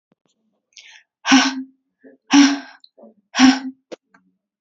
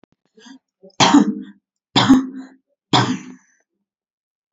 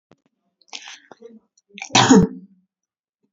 exhalation_length: 4.6 s
exhalation_amplitude: 31604
exhalation_signal_mean_std_ratio: 0.34
three_cough_length: 4.5 s
three_cough_amplitude: 32767
three_cough_signal_mean_std_ratio: 0.36
cough_length: 3.3 s
cough_amplitude: 27992
cough_signal_mean_std_ratio: 0.28
survey_phase: beta (2021-08-13 to 2022-03-07)
age: 18-44
gender: Female
wearing_mask: 'No'
symptom_none: true
smoker_status: Never smoked
respiratory_condition_asthma: false
respiratory_condition_other: false
recruitment_source: REACT
submission_delay: 1 day
covid_test_result: Negative
covid_test_method: RT-qPCR
influenza_a_test_result: Negative
influenza_b_test_result: Negative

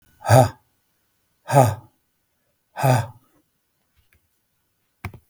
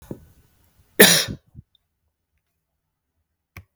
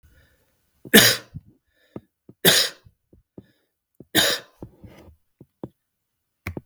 exhalation_length: 5.3 s
exhalation_amplitude: 32766
exhalation_signal_mean_std_ratio: 0.28
cough_length: 3.8 s
cough_amplitude: 32768
cough_signal_mean_std_ratio: 0.21
three_cough_length: 6.7 s
three_cough_amplitude: 32768
three_cough_signal_mean_std_ratio: 0.26
survey_phase: beta (2021-08-13 to 2022-03-07)
age: 45-64
gender: Male
wearing_mask: 'No'
symptom_none: true
smoker_status: Never smoked
respiratory_condition_asthma: false
respiratory_condition_other: false
recruitment_source: REACT
submission_delay: 2 days
covid_test_result: Negative
covid_test_method: RT-qPCR
influenza_a_test_result: Negative
influenza_b_test_result: Negative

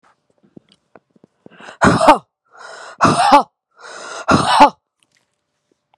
exhalation_length: 6.0 s
exhalation_amplitude: 32768
exhalation_signal_mean_std_ratio: 0.36
survey_phase: beta (2021-08-13 to 2022-03-07)
age: 18-44
gender: Female
wearing_mask: 'No'
symptom_none: true
smoker_status: Ex-smoker
respiratory_condition_asthma: false
respiratory_condition_other: false
recruitment_source: REACT
submission_delay: 1 day
covid_test_result: Negative
covid_test_method: RT-qPCR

